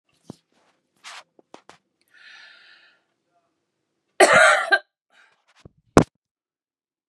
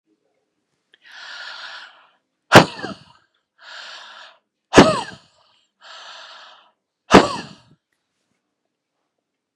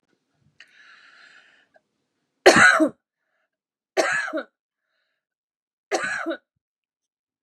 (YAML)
cough_length: 7.1 s
cough_amplitude: 32768
cough_signal_mean_std_ratio: 0.22
exhalation_length: 9.6 s
exhalation_amplitude: 32768
exhalation_signal_mean_std_ratio: 0.21
three_cough_length: 7.4 s
three_cough_amplitude: 32767
three_cough_signal_mean_std_ratio: 0.27
survey_phase: beta (2021-08-13 to 2022-03-07)
age: 45-64
gender: Female
wearing_mask: 'No'
symptom_none: true
smoker_status: Ex-smoker
respiratory_condition_asthma: false
respiratory_condition_other: false
recruitment_source: REACT
submission_delay: 1 day
covid_test_result: Negative
covid_test_method: RT-qPCR
influenza_a_test_result: Negative
influenza_b_test_result: Negative